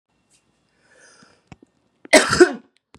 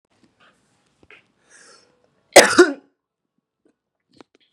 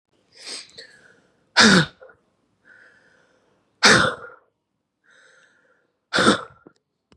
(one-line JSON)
{"three_cough_length": "3.0 s", "three_cough_amplitude": 32767, "three_cough_signal_mean_std_ratio": 0.24, "cough_length": "4.5 s", "cough_amplitude": 32768, "cough_signal_mean_std_ratio": 0.19, "exhalation_length": "7.2 s", "exhalation_amplitude": 32648, "exhalation_signal_mean_std_ratio": 0.28, "survey_phase": "beta (2021-08-13 to 2022-03-07)", "age": "18-44", "gender": "Female", "wearing_mask": "No", "symptom_cough_any": true, "symptom_runny_or_blocked_nose": true, "symptom_sore_throat": true, "symptom_fatigue": true, "symptom_other": true, "smoker_status": "Never smoked", "respiratory_condition_asthma": false, "respiratory_condition_other": false, "recruitment_source": "Test and Trace", "submission_delay": "2 days", "covid_test_result": "Positive", "covid_test_method": "LFT"}